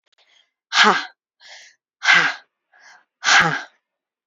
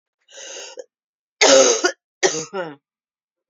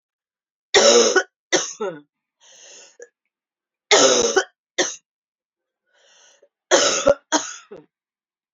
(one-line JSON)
{"exhalation_length": "4.3 s", "exhalation_amplitude": 31162, "exhalation_signal_mean_std_ratio": 0.37, "cough_length": "3.5 s", "cough_amplitude": 32767, "cough_signal_mean_std_ratio": 0.37, "three_cough_length": "8.5 s", "three_cough_amplitude": 28844, "three_cough_signal_mean_std_ratio": 0.37, "survey_phase": "beta (2021-08-13 to 2022-03-07)", "age": "45-64", "gender": "Female", "wearing_mask": "No", "symptom_cough_any": true, "symptom_runny_or_blocked_nose": true, "symptom_fatigue": true, "symptom_headache": true, "symptom_other": true, "symptom_onset": "2 days", "smoker_status": "Never smoked", "respiratory_condition_asthma": false, "respiratory_condition_other": false, "recruitment_source": "Test and Trace", "submission_delay": "1 day", "covid_test_result": "Positive", "covid_test_method": "RT-qPCR", "covid_ct_value": 15.0, "covid_ct_gene": "ORF1ab gene", "covid_ct_mean": 15.9, "covid_viral_load": "6000000 copies/ml", "covid_viral_load_category": "High viral load (>1M copies/ml)"}